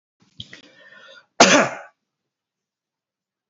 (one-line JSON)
{"cough_length": "3.5 s", "cough_amplitude": 31491, "cough_signal_mean_std_ratio": 0.23, "survey_phase": "beta (2021-08-13 to 2022-03-07)", "age": "45-64", "gender": "Male", "wearing_mask": "No", "symptom_cough_any": true, "symptom_runny_or_blocked_nose": true, "symptom_onset": "3 days", "smoker_status": "Never smoked", "respiratory_condition_asthma": false, "respiratory_condition_other": false, "recruitment_source": "Test and Trace", "submission_delay": "2 days", "covid_test_result": "Positive", "covid_test_method": "RT-qPCR", "covid_ct_value": 16.2, "covid_ct_gene": "ORF1ab gene", "covid_ct_mean": 16.4, "covid_viral_load": "4100000 copies/ml", "covid_viral_load_category": "High viral load (>1M copies/ml)"}